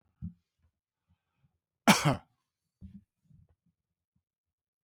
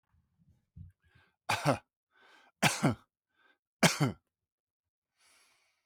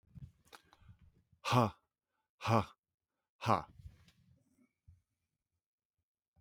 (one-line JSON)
{"cough_length": "4.8 s", "cough_amplitude": 12635, "cough_signal_mean_std_ratio": 0.18, "three_cough_length": "5.9 s", "three_cough_amplitude": 13016, "three_cough_signal_mean_std_ratio": 0.27, "exhalation_length": "6.4 s", "exhalation_amplitude": 6431, "exhalation_signal_mean_std_ratio": 0.24, "survey_phase": "beta (2021-08-13 to 2022-03-07)", "age": "45-64", "gender": "Male", "wearing_mask": "No", "symptom_none": true, "smoker_status": "Never smoked", "respiratory_condition_asthma": false, "respiratory_condition_other": false, "recruitment_source": "REACT", "submission_delay": "4 days", "covid_test_result": "Negative", "covid_test_method": "RT-qPCR", "influenza_a_test_result": "Unknown/Void", "influenza_b_test_result": "Unknown/Void"}